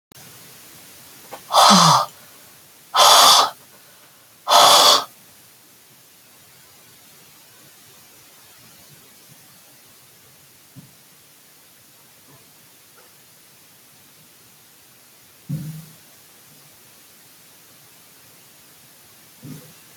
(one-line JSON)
{"exhalation_length": "20.0 s", "exhalation_amplitude": 32768, "exhalation_signal_mean_std_ratio": 0.27, "survey_phase": "alpha (2021-03-01 to 2021-08-12)", "age": "65+", "gender": "Female", "wearing_mask": "No", "symptom_none": true, "smoker_status": "Ex-smoker", "respiratory_condition_asthma": false, "respiratory_condition_other": false, "recruitment_source": "REACT", "submission_delay": "4 days", "covid_test_result": "Negative", "covid_test_method": "RT-qPCR"}